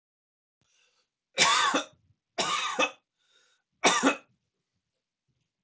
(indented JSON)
{
  "three_cough_length": "5.6 s",
  "three_cough_amplitude": 13708,
  "three_cough_signal_mean_std_ratio": 0.37,
  "survey_phase": "beta (2021-08-13 to 2022-03-07)",
  "age": "45-64",
  "gender": "Male",
  "wearing_mask": "No",
  "symptom_none": true,
  "smoker_status": "Ex-smoker",
  "respiratory_condition_asthma": false,
  "respiratory_condition_other": false,
  "recruitment_source": "REACT",
  "submission_delay": "3 days",
  "covid_test_result": "Negative",
  "covid_test_method": "RT-qPCR"
}